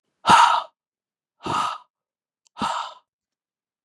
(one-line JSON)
{"exhalation_length": "3.8 s", "exhalation_amplitude": 26458, "exhalation_signal_mean_std_ratio": 0.34, "survey_phase": "beta (2021-08-13 to 2022-03-07)", "age": "18-44", "gender": "Male", "wearing_mask": "No", "symptom_cough_any": true, "symptom_runny_or_blocked_nose": true, "symptom_sore_throat": true, "symptom_onset": "4 days", "smoker_status": "Current smoker (1 to 10 cigarettes per day)", "respiratory_condition_asthma": false, "respiratory_condition_other": false, "recruitment_source": "Test and Trace", "submission_delay": "2 days", "covid_test_result": "Negative", "covid_test_method": "ePCR"}